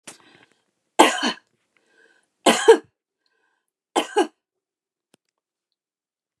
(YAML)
three_cough_length: 6.4 s
three_cough_amplitude: 29204
three_cough_signal_mean_std_ratio: 0.23
survey_phase: beta (2021-08-13 to 2022-03-07)
age: 65+
gender: Female
wearing_mask: 'No'
symptom_none: true
smoker_status: Never smoked
respiratory_condition_asthma: false
respiratory_condition_other: false
recruitment_source: REACT
submission_delay: 2 days
covid_test_result: Negative
covid_test_method: RT-qPCR